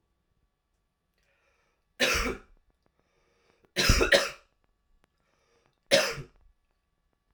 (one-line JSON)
{"three_cough_length": "7.3 s", "three_cough_amplitude": 17061, "three_cough_signal_mean_std_ratio": 0.29, "survey_phase": "alpha (2021-03-01 to 2021-08-12)", "age": "18-44", "gender": "Male", "wearing_mask": "No", "symptom_cough_any": true, "symptom_new_continuous_cough": true, "symptom_abdominal_pain": true, "symptom_diarrhoea": true, "symptom_fatigue": true, "symptom_fever_high_temperature": true, "symptom_headache": true, "symptom_change_to_sense_of_smell_or_taste": true, "symptom_loss_of_taste": true, "smoker_status": "Never smoked", "respiratory_condition_asthma": false, "respiratory_condition_other": false, "recruitment_source": "Test and Trace", "submission_delay": "2 days", "covid_test_result": "Positive", "covid_test_method": "RT-qPCR"}